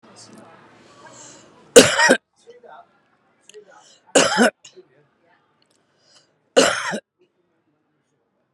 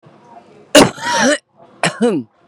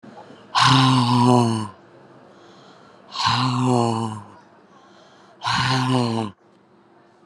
three_cough_length: 8.5 s
three_cough_amplitude: 32768
three_cough_signal_mean_std_ratio: 0.26
cough_length: 2.5 s
cough_amplitude: 32768
cough_signal_mean_std_ratio: 0.45
exhalation_length: 7.3 s
exhalation_amplitude: 28602
exhalation_signal_mean_std_ratio: 0.53
survey_phase: beta (2021-08-13 to 2022-03-07)
age: 45-64
gender: Female
wearing_mask: 'Yes'
symptom_cough_any: true
symptom_headache: true
smoker_status: Current smoker (11 or more cigarettes per day)
respiratory_condition_asthma: true
respiratory_condition_other: true
recruitment_source: REACT
submission_delay: 3 days
covid_test_result: Negative
covid_test_method: RT-qPCR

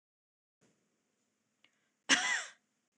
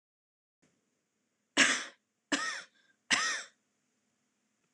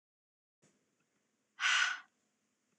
cough_length: 3.0 s
cough_amplitude: 7776
cough_signal_mean_std_ratio: 0.25
three_cough_length: 4.7 s
three_cough_amplitude: 9943
three_cough_signal_mean_std_ratio: 0.3
exhalation_length: 2.8 s
exhalation_amplitude: 4025
exhalation_signal_mean_std_ratio: 0.29
survey_phase: beta (2021-08-13 to 2022-03-07)
age: 18-44
gender: Female
wearing_mask: 'No'
symptom_headache: true
smoker_status: Never smoked
respiratory_condition_asthma: false
respiratory_condition_other: false
recruitment_source: REACT
submission_delay: 1 day
covid_test_result: Negative
covid_test_method: RT-qPCR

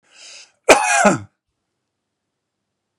cough_length: 3.0 s
cough_amplitude: 32768
cough_signal_mean_std_ratio: 0.3
survey_phase: beta (2021-08-13 to 2022-03-07)
age: 65+
gender: Male
wearing_mask: 'No'
symptom_none: true
smoker_status: Current smoker (e-cigarettes or vapes only)
respiratory_condition_asthma: true
respiratory_condition_other: false
recruitment_source: REACT
submission_delay: 2 days
covid_test_result: Negative
covid_test_method: RT-qPCR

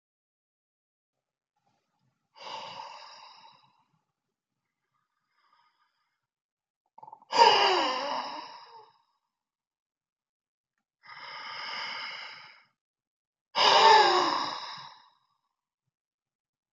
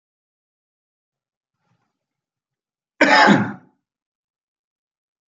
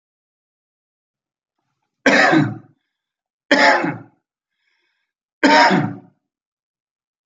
exhalation_length: 16.7 s
exhalation_amplitude: 16542
exhalation_signal_mean_std_ratio: 0.29
cough_length: 5.3 s
cough_amplitude: 28846
cough_signal_mean_std_ratio: 0.23
three_cough_length: 7.3 s
three_cough_amplitude: 30277
three_cough_signal_mean_std_ratio: 0.35
survey_phase: beta (2021-08-13 to 2022-03-07)
age: 65+
gender: Male
wearing_mask: 'No'
symptom_none: true
smoker_status: Never smoked
respiratory_condition_asthma: false
respiratory_condition_other: false
recruitment_source: Test and Trace
submission_delay: 0 days
covid_test_result: Negative
covid_test_method: LFT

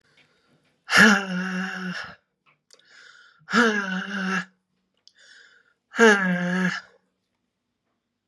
exhalation_length: 8.3 s
exhalation_amplitude: 30151
exhalation_signal_mean_std_ratio: 0.4
survey_phase: beta (2021-08-13 to 2022-03-07)
age: 45-64
gender: Female
wearing_mask: 'No'
symptom_cough_any: true
symptom_change_to_sense_of_smell_or_taste: true
smoker_status: Ex-smoker
respiratory_condition_asthma: false
respiratory_condition_other: false
recruitment_source: REACT
submission_delay: 1 day
covid_test_result: Negative
covid_test_method: RT-qPCR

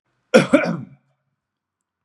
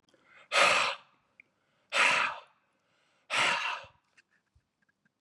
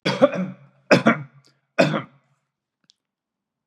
cough_length: 2.0 s
cough_amplitude: 32767
cough_signal_mean_std_ratio: 0.3
exhalation_length: 5.2 s
exhalation_amplitude: 9411
exhalation_signal_mean_std_ratio: 0.4
three_cough_length: 3.7 s
three_cough_amplitude: 30363
three_cough_signal_mean_std_ratio: 0.33
survey_phase: beta (2021-08-13 to 2022-03-07)
age: 45-64
gender: Male
wearing_mask: 'No'
symptom_none: true
smoker_status: Ex-smoker
respiratory_condition_asthma: false
respiratory_condition_other: false
recruitment_source: REACT
submission_delay: 2 days
covid_test_result: Positive
covid_test_method: RT-qPCR
covid_ct_value: 37.1
covid_ct_gene: E gene
influenza_a_test_result: Negative
influenza_b_test_result: Negative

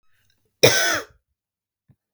cough_length: 2.1 s
cough_amplitude: 32767
cough_signal_mean_std_ratio: 0.3
survey_phase: beta (2021-08-13 to 2022-03-07)
age: 45-64
gender: Female
wearing_mask: 'No'
symptom_headache: true
symptom_onset: 3 days
smoker_status: Never smoked
respiratory_condition_asthma: false
respiratory_condition_other: false
recruitment_source: Test and Trace
submission_delay: 1 day
covid_test_result: Negative
covid_test_method: ePCR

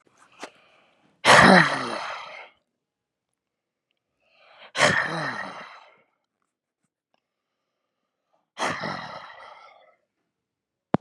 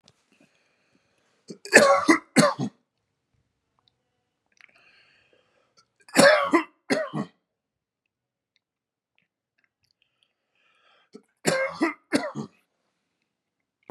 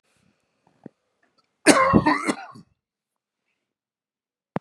exhalation_length: 11.0 s
exhalation_amplitude: 29421
exhalation_signal_mean_std_ratio: 0.27
three_cough_length: 13.9 s
three_cough_amplitude: 31710
three_cough_signal_mean_std_ratio: 0.27
cough_length: 4.6 s
cough_amplitude: 32767
cough_signal_mean_std_ratio: 0.28
survey_phase: beta (2021-08-13 to 2022-03-07)
age: 65+
gender: Male
wearing_mask: 'No'
symptom_none: true
smoker_status: Ex-smoker
respiratory_condition_asthma: false
respiratory_condition_other: false
recruitment_source: REACT
submission_delay: 5 days
covid_test_result: Negative
covid_test_method: RT-qPCR
influenza_a_test_result: Negative
influenza_b_test_result: Negative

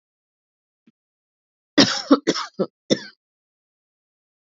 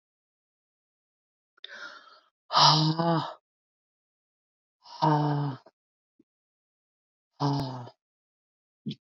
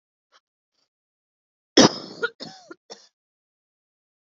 cough_length: 4.4 s
cough_amplitude: 28972
cough_signal_mean_std_ratio: 0.25
exhalation_length: 9.0 s
exhalation_amplitude: 16647
exhalation_signal_mean_std_ratio: 0.34
three_cough_length: 4.3 s
three_cough_amplitude: 28442
three_cough_signal_mean_std_ratio: 0.17
survey_phase: beta (2021-08-13 to 2022-03-07)
age: 18-44
gender: Female
wearing_mask: 'No'
symptom_cough_any: true
symptom_runny_or_blocked_nose: true
symptom_sore_throat: true
symptom_fatigue: true
symptom_headache: true
symptom_onset: 2 days
smoker_status: Never smoked
respiratory_condition_asthma: true
respiratory_condition_other: false
recruitment_source: Test and Trace
submission_delay: 1 day
covid_test_result: Positive
covid_test_method: RT-qPCR
covid_ct_value: 19.3
covid_ct_gene: ORF1ab gene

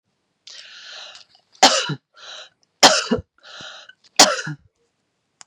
three_cough_length: 5.5 s
three_cough_amplitude: 32768
three_cough_signal_mean_std_ratio: 0.29
survey_phase: beta (2021-08-13 to 2022-03-07)
age: 45-64
gender: Female
wearing_mask: 'No'
symptom_other: true
smoker_status: Ex-smoker
respiratory_condition_asthma: true
respiratory_condition_other: false
recruitment_source: Test and Trace
submission_delay: 2 days
covid_test_result: Positive
covid_test_method: LFT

